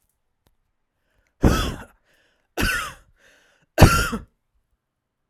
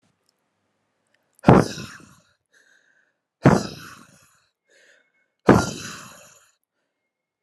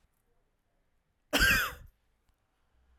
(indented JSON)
{
  "three_cough_length": "5.3 s",
  "three_cough_amplitude": 32768,
  "three_cough_signal_mean_std_ratio": 0.28,
  "exhalation_length": "7.4 s",
  "exhalation_amplitude": 32768,
  "exhalation_signal_mean_std_ratio": 0.22,
  "cough_length": "3.0 s",
  "cough_amplitude": 8267,
  "cough_signal_mean_std_ratio": 0.29,
  "survey_phase": "alpha (2021-03-01 to 2021-08-12)",
  "age": "18-44",
  "gender": "Female",
  "wearing_mask": "No",
  "symptom_none": true,
  "smoker_status": "Ex-smoker",
  "respiratory_condition_asthma": true,
  "respiratory_condition_other": false,
  "recruitment_source": "REACT",
  "submission_delay": "1 day",
  "covid_test_result": "Negative",
  "covid_test_method": "RT-qPCR"
}